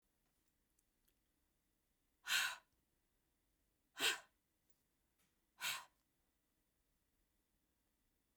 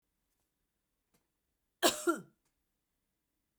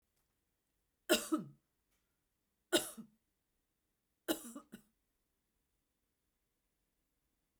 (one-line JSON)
{"exhalation_length": "8.4 s", "exhalation_amplitude": 1929, "exhalation_signal_mean_std_ratio": 0.22, "cough_length": "3.6 s", "cough_amplitude": 7693, "cough_signal_mean_std_ratio": 0.2, "three_cough_length": "7.6 s", "three_cough_amplitude": 5205, "three_cough_signal_mean_std_ratio": 0.2, "survey_phase": "beta (2021-08-13 to 2022-03-07)", "age": "45-64", "gender": "Female", "wearing_mask": "No", "symptom_none": true, "smoker_status": "Ex-smoker", "respiratory_condition_asthma": false, "respiratory_condition_other": false, "recruitment_source": "REACT", "submission_delay": "2 days", "covid_test_result": "Negative", "covid_test_method": "RT-qPCR", "influenza_a_test_result": "Negative", "influenza_b_test_result": "Negative"}